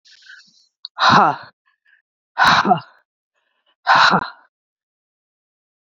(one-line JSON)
{"exhalation_length": "6.0 s", "exhalation_amplitude": 30057, "exhalation_signal_mean_std_ratio": 0.35, "survey_phase": "beta (2021-08-13 to 2022-03-07)", "age": "45-64", "gender": "Female", "wearing_mask": "No", "symptom_cough_any": true, "symptom_runny_or_blocked_nose": true, "symptom_sore_throat": true, "symptom_fatigue": true, "symptom_headache": true, "symptom_other": true, "smoker_status": "Never smoked", "respiratory_condition_asthma": false, "respiratory_condition_other": false, "recruitment_source": "Test and Trace", "submission_delay": "2 days", "covid_test_result": "Positive", "covid_test_method": "LAMP"}